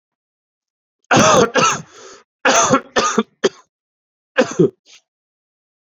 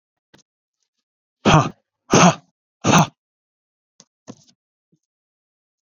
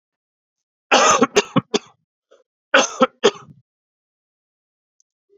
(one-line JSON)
{"three_cough_length": "6.0 s", "three_cough_amplitude": 32767, "three_cough_signal_mean_std_ratio": 0.41, "exhalation_length": "6.0 s", "exhalation_amplitude": 30107, "exhalation_signal_mean_std_ratio": 0.26, "cough_length": "5.4 s", "cough_amplitude": 32601, "cough_signal_mean_std_ratio": 0.3, "survey_phase": "alpha (2021-03-01 to 2021-08-12)", "age": "45-64", "gender": "Male", "wearing_mask": "No", "symptom_cough_any": true, "symptom_fever_high_temperature": true, "symptom_headache": true, "symptom_change_to_sense_of_smell_or_taste": true, "symptom_onset": "2 days", "smoker_status": "Current smoker (1 to 10 cigarettes per day)", "respiratory_condition_asthma": false, "respiratory_condition_other": false, "recruitment_source": "Test and Trace", "submission_delay": "2 days", "covid_test_result": "Positive", "covid_test_method": "RT-qPCR"}